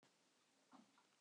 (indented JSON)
{
  "cough_length": "1.2 s",
  "cough_amplitude": 85,
  "cough_signal_mean_std_ratio": 0.73,
  "survey_phase": "beta (2021-08-13 to 2022-03-07)",
  "age": "65+",
  "gender": "Female",
  "wearing_mask": "No",
  "symptom_cough_any": true,
  "symptom_runny_or_blocked_nose": true,
  "symptom_sore_throat": true,
  "symptom_diarrhoea": true,
  "symptom_fatigue": true,
  "symptom_headache": true,
  "symptom_other": true,
  "symptom_onset": "5 days",
  "smoker_status": "Never smoked",
  "respiratory_condition_asthma": false,
  "respiratory_condition_other": false,
  "recruitment_source": "Test and Trace",
  "submission_delay": "2 days",
  "covid_test_result": "Positive",
  "covid_test_method": "RT-qPCR",
  "covid_ct_value": 14.2,
  "covid_ct_gene": "N gene"
}